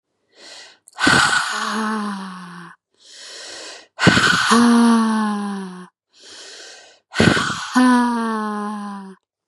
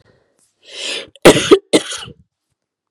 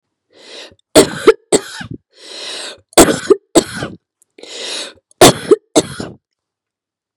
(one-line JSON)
{"exhalation_length": "9.5 s", "exhalation_amplitude": 32768, "exhalation_signal_mean_std_ratio": 0.6, "cough_length": "2.9 s", "cough_amplitude": 32768, "cough_signal_mean_std_ratio": 0.31, "three_cough_length": "7.2 s", "three_cough_amplitude": 32768, "three_cough_signal_mean_std_ratio": 0.33, "survey_phase": "beta (2021-08-13 to 2022-03-07)", "age": "18-44", "gender": "Female", "wearing_mask": "No", "symptom_none": true, "smoker_status": "Never smoked", "respiratory_condition_asthma": false, "respiratory_condition_other": false, "recruitment_source": "REACT", "submission_delay": "1 day", "covid_test_result": "Negative", "covid_test_method": "RT-qPCR", "influenza_a_test_result": "Negative", "influenza_b_test_result": "Negative"}